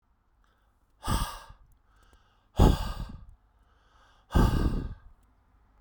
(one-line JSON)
{"exhalation_length": "5.8 s", "exhalation_amplitude": 17807, "exhalation_signal_mean_std_ratio": 0.34, "survey_phase": "beta (2021-08-13 to 2022-03-07)", "age": "18-44", "gender": "Male", "wearing_mask": "No", "symptom_cough_any": true, "symptom_new_continuous_cough": true, "symptom_runny_or_blocked_nose": true, "symptom_shortness_of_breath": true, "symptom_fatigue": true, "symptom_fever_high_temperature": true, "symptom_onset": "3 days", "smoker_status": "Ex-smoker", "respiratory_condition_asthma": false, "respiratory_condition_other": false, "recruitment_source": "Test and Trace", "submission_delay": "2 days", "covid_test_result": "Positive", "covid_test_method": "RT-qPCR", "covid_ct_value": 14.8, "covid_ct_gene": "ORF1ab gene", "covid_ct_mean": 15.9, "covid_viral_load": "6000000 copies/ml", "covid_viral_load_category": "High viral load (>1M copies/ml)"}